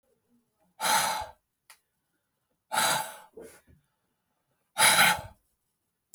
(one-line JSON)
{"exhalation_length": "6.1 s", "exhalation_amplitude": 12800, "exhalation_signal_mean_std_ratio": 0.35, "survey_phase": "beta (2021-08-13 to 2022-03-07)", "age": "45-64", "gender": "Male", "wearing_mask": "No", "symptom_none": true, "smoker_status": "Never smoked", "respiratory_condition_asthma": false, "respiratory_condition_other": false, "recruitment_source": "REACT", "submission_delay": "1 day", "covid_test_result": "Negative", "covid_test_method": "RT-qPCR"}